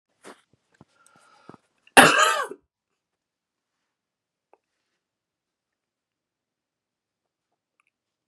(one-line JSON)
{"cough_length": "8.3 s", "cough_amplitude": 32767, "cough_signal_mean_std_ratio": 0.17, "survey_phase": "beta (2021-08-13 to 2022-03-07)", "age": "18-44", "gender": "Male", "wearing_mask": "No", "symptom_cough_any": true, "symptom_runny_or_blocked_nose": true, "symptom_sore_throat": true, "symptom_abdominal_pain": true, "symptom_onset": "3 days", "smoker_status": "Ex-smoker", "respiratory_condition_asthma": false, "respiratory_condition_other": false, "recruitment_source": "Test and Trace", "submission_delay": "2 days", "covid_test_result": "Positive", "covid_test_method": "RT-qPCR", "covid_ct_value": 22.9, "covid_ct_gene": "N gene", "covid_ct_mean": 22.9, "covid_viral_load": "30000 copies/ml", "covid_viral_load_category": "Low viral load (10K-1M copies/ml)"}